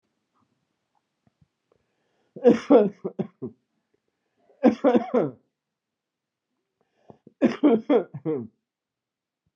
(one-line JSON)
{"three_cough_length": "9.6 s", "three_cough_amplitude": 19038, "three_cough_signal_mean_std_ratio": 0.3, "survey_phase": "beta (2021-08-13 to 2022-03-07)", "age": "45-64", "gender": "Male", "wearing_mask": "No", "symptom_cough_any": true, "symptom_new_continuous_cough": true, "symptom_sore_throat": true, "symptom_fatigue": true, "symptom_headache": true, "symptom_change_to_sense_of_smell_or_taste": true, "symptom_onset": "3 days", "smoker_status": "Never smoked", "respiratory_condition_asthma": false, "respiratory_condition_other": false, "recruitment_source": "Test and Trace", "submission_delay": "1 day", "covid_test_result": "Positive", "covid_test_method": "RT-qPCR", "covid_ct_value": 19.7, "covid_ct_gene": "ORF1ab gene"}